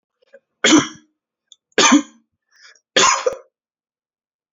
three_cough_length: 4.5 s
three_cough_amplitude: 30113
three_cough_signal_mean_std_ratio: 0.33
survey_phase: beta (2021-08-13 to 2022-03-07)
age: 18-44
gender: Male
wearing_mask: 'No'
symptom_none: true
smoker_status: Never smoked
respiratory_condition_asthma: false
respiratory_condition_other: false
recruitment_source: REACT
submission_delay: 1 day
covid_test_result: Negative
covid_test_method: RT-qPCR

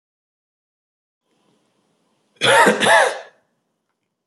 cough_length: 4.3 s
cough_amplitude: 27585
cough_signal_mean_std_ratio: 0.33
survey_phase: beta (2021-08-13 to 2022-03-07)
age: 18-44
gender: Male
wearing_mask: 'No'
symptom_none: true
smoker_status: Ex-smoker
respiratory_condition_asthma: false
respiratory_condition_other: false
recruitment_source: REACT
submission_delay: 2 days
covid_test_result: Negative
covid_test_method: RT-qPCR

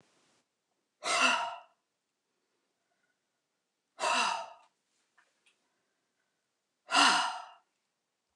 exhalation_length: 8.4 s
exhalation_amplitude: 9042
exhalation_signal_mean_std_ratio: 0.31
survey_phase: beta (2021-08-13 to 2022-03-07)
age: 45-64
gender: Female
wearing_mask: 'No'
symptom_none: true
smoker_status: Never smoked
respiratory_condition_asthma: false
respiratory_condition_other: false
recruitment_source: REACT
submission_delay: 2 days
covid_test_result: Negative
covid_test_method: RT-qPCR
influenza_a_test_result: Negative
influenza_b_test_result: Negative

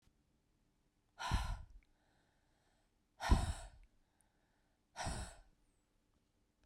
exhalation_length: 6.7 s
exhalation_amplitude: 3636
exhalation_signal_mean_std_ratio: 0.29
survey_phase: beta (2021-08-13 to 2022-03-07)
age: 45-64
gender: Female
wearing_mask: 'No'
symptom_cough_any: true
symptom_new_continuous_cough: true
symptom_runny_or_blocked_nose: true
symptom_sore_throat: true
symptom_diarrhoea: true
symptom_fatigue: true
symptom_headache: true
symptom_change_to_sense_of_smell_or_taste: true
symptom_loss_of_taste: true
symptom_onset: 7 days
smoker_status: Current smoker (e-cigarettes or vapes only)
respiratory_condition_asthma: false
respiratory_condition_other: false
recruitment_source: Test and Trace
submission_delay: 2 days
covid_test_result: Positive
covid_test_method: RT-qPCR
covid_ct_value: 20.4
covid_ct_gene: ORF1ab gene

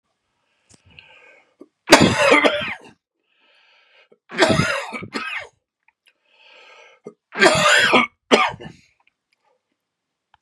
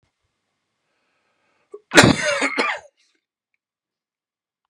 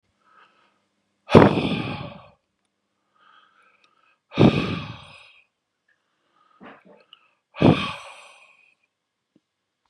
three_cough_length: 10.4 s
three_cough_amplitude: 32768
three_cough_signal_mean_std_ratio: 0.37
cough_length: 4.7 s
cough_amplitude: 32768
cough_signal_mean_std_ratio: 0.26
exhalation_length: 9.9 s
exhalation_amplitude: 32768
exhalation_signal_mean_std_ratio: 0.25
survey_phase: beta (2021-08-13 to 2022-03-07)
age: 45-64
gender: Male
wearing_mask: 'No'
symptom_cough_any: true
symptom_runny_or_blocked_nose: true
symptom_sore_throat: true
symptom_headache: true
symptom_onset: 8 days
smoker_status: Never smoked
respiratory_condition_asthma: false
respiratory_condition_other: false
recruitment_source: Test and Trace
submission_delay: 2 days
covid_test_result: Positive
covid_test_method: RT-qPCR
covid_ct_value: 24.7
covid_ct_gene: ORF1ab gene
covid_ct_mean: 25.0
covid_viral_load: 6200 copies/ml
covid_viral_load_category: Minimal viral load (< 10K copies/ml)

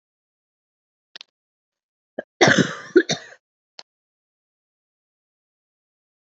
cough_length: 6.2 s
cough_amplitude: 32767
cough_signal_mean_std_ratio: 0.2
survey_phase: alpha (2021-03-01 to 2021-08-12)
age: 45-64
gender: Female
wearing_mask: 'No'
symptom_cough_any: true
symptom_new_continuous_cough: true
symptom_shortness_of_breath: true
symptom_fatigue: true
symptom_fever_high_temperature: true
symptom_headache: true
symptom_change_to_sense_of_smell_or_taste: true
symptom_loss_of_taste: true
smoker_status: Never smoked
respiratory_condition_asthma: false
respiratory_condition_other: false
recruitment_source: Test and Trace
submission_delay: 2 days
covid_test_result: Positive
covid_test_method: LFT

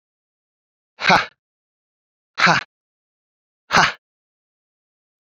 exhalation_length: 5.2 s
exhalation_amplitude: 30775
exhalation_signal_mean_std_ratio: 0.26
survey_phase: beta (2021-08-13 to 2022-03-07)
age: 18-44
gender: Male
wearing_mask: 'No'
symptom_none: true
smoker_status: Never smoked
respiratory_condition_asthma: false
respiratory_condition_other: false
recruitment_source: REACT
submission_delay: 2 days
covid_test_result: Negative
covid_test_method: RT-qPCR
influenza_a_test_result: Negative
influenza_b_test_result: Negative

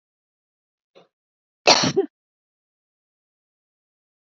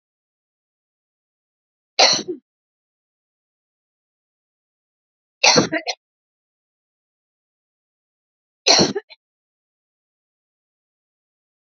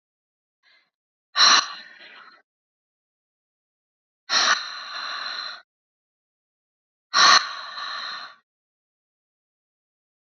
cough_length: 4.3 s
cough_amplitude: 32614
cough_signal_mean_std_ratio: 0.2
three_cough_length: 11.8 s
three_cough_amplitude: 32768
three_cough_signal_mean_std_ratio: 0.2
exhalation_length: 10.2 s
exhalation_amplitude: 26556
exhalation_signal_mean_std_ratio: 0.29
survey_phase: beta (2021-08-13 to 2022-03-07)
age: 45-64
gender: Female
wearing_mask: 'No'
symptom_none: true
smoker_status: Never smoked
respiratory_condition_asthma: false
respiratory_condition_other: false
recruitment_source: REACT
submission_delay: 3 days
covid_test_result: Negative
covid_test_method: RT-qPCR
influenza_a_test_result: Negative
influenza_b_test_result: Negative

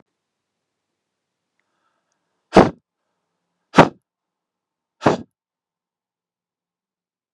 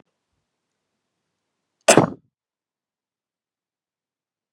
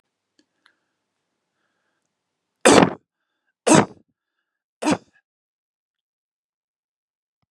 exhalation_length: 7.3 s
exhalation_amplitude: 32768
exhalation_signal_mean_std_ratio: 0.15
cough_length: 4.5 s
cough_amplitude: 32768
cough_signal_mean_std_ratio: 0.14
three_cough_length: 7.5 s
three_cough_amplitude: 32768
three_cough_signal_mean_std_ratio: 0.2
survey_phase: beta (2021-08-13 to 2022-03-07)
age: 45-64
gender: Male
wearing_mask: 'No'
symptom_none: true
smoker_status: Never smoked
respiratory_condition_asthma: false
respiratory_condition_other: false
recruitment_source: REACT
submission_delay: 0 days
covid_test_result: Negative
covid_test_method: RT-qPCR
influenza_a_test_result: Negative
influenza_b_test_result: Negative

